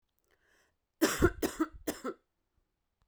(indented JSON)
{
  "cough_length": "3.1 s",
  "cough_amplitude": 7424,
  "cough_signal_mean_std_ratio": 0.32,
  "survey_phase": "beta (2021-08-13 to 2022-03-07)",
  "age": "18-44",
  "gender": "Female",
  "wearing_mask": "No",
  "symptom_cough_any": true,
  "symptom_new_continuous_cough": true,
  "symptom_runny_or_blocked_nose": true,
  "symptom_fatigue": true,
  "symptom_fever_high_temperature": true,
  "symptom_headache": true,
  "symptom_change_to_sense_of_smell_or_taste": true,
  "symptom_loss_of_taste": true,
  "smoker_status": "Never smoked",
  "respiratory_condition_asthma": false,
  "respiratory_condition_other": false,
  "recruitment_source": "Test and Trace",
  "submission_delay": "1 day",
  "covid_test_result": "Positive",
  "covid_test_method": "LFT"
}